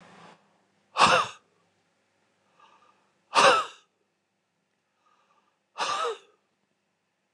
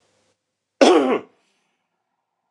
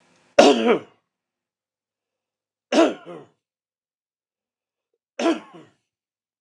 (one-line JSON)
{"exhalation_length": "7.3 s", "exhalation_amplitude": 17806, "exhalation_signal_mean_std_ratio": 0.27, "cough_length": "2.5 s", "cough_amplitude": 29203, "cough_signal_mean_std_ratio": 0.3, "three_cough_length": "6.4 s", "three_cough_amplitude": 29204, "three_cough_signal_mean_std_ratio": 0.26, "survey_phase": "beta (2021-08-13 to 2022-03-07)", "age": "45-64", "gender": "Male", "wearing_mask": "No", "symptom_none": true, "smoker_status": "Ex-smoker", "respiratory_condition_asthma": false, "respiratory_condition_other": false, "recruitment_source": "REACT", "submission_delay": "2 days", "covid_test_result": "Negative", "covid_test_method": "RT-qPCR"}